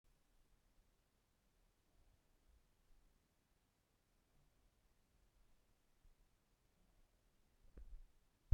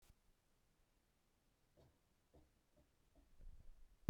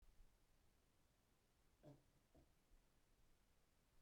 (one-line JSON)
{"exhalation_length": "8.5 s", "exhalation_amplitude": 2453, "exhalation_signal_mean_std_ratio": 0.13, "three_cough_length": "4.1 s", "three_cough_amplitude": 2442, "three_cough_signal_mean_std_ratio": 0.14, "cough_length": "4.0 s", "cough_amplitude": 64, "cough_signal_mean_std_ratio": 0.82, "survey_phase": "beta (2021-08-13 to 2022-03-07)", "age": "18-44", "gender": "Male", "wearing_mask": "No", "symptom_none": true, "smoker_status": "Never smoked", "respiratory_condition_asthma": false, "respiratory_condition_other": false, "recruitment_source": "REACT", "submission_delay": "0 days", "covid_test_result": "Negative", "covid_test_method": "RT-qPCR"}